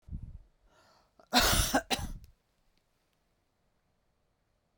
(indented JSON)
{
  "cough_length": "4.8 s",
  "cough_amplitude": 8781,
  "cough_signal_mean_std_ratio": 0.31,
  "survey_phase": "beta (2021-08-13 to 2022-03-07)",
  "age": "65+",
  "gender": "Female",
  "wearing_mask": "No",
  "symptom_cough_any": true,
  "symptom_runny_or_blocked_nose": true,
  "symptom_sore_throat": true,
  "symptom_fatigue": true,
  "smoker_status": "Ex-smoker",
  "respiratory_condition_asthma": false,
  "respiratory_condition_other": false,
  "recruitment_source": "Test and Trace",
  "submission_delay": "2 days",
  "covid_test_result": "Positive",
  "covid_test_method": "RT-qPCR"
}